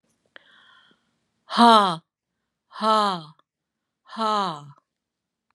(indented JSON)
{
  "exhalation_length": "5.5 s",
  "exhalation_amplitude": 26679,
  "exhalation_signal_mean_std_ratio": 0.32,
  "survey_phase": "beta (2021-08-13 to 2022-03-07)",
  "age": "45-64",
  "gender": "Female",
  "wearing_mask": "No",
  "symptom_runny_or_blocked_nose": true,
  "smoker_status": "Never smoked",
  "respiratory_condition_asthma": false,
  "respiratory_condition_other": false,
  "recruitment_source": "REACT",
  "submission_delay": "5 days",
  "covid_test_result": "Negative",
  "covid_test_method": "RT-qPCR",
  "influenza_a_test_result": "Negative",
  "influenza_b_test_result": "Negative"
}